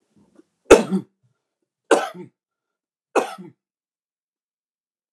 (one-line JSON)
{"three_cough_length": "5.1 s", "three_cough_amplitude": 29204, "three_cough_signal_mean_std_ratio": 0.21, "survey_phase": "alpha (2021-03-01 to 2021-08-12)", "age": "65+", "gender": "Male", "wearing_mask": "No", "symptom_none": true, "symptom_onset": "3 days", "smoker_status": "Never smoked", "respiratory_condition_asthma": false, "respiratory_condition_other": false, "recruitment_source": "REACT", "submission_delay": "2 days", "covid_test_result": "Negative", "covid_test_method": "RT-qPCR"}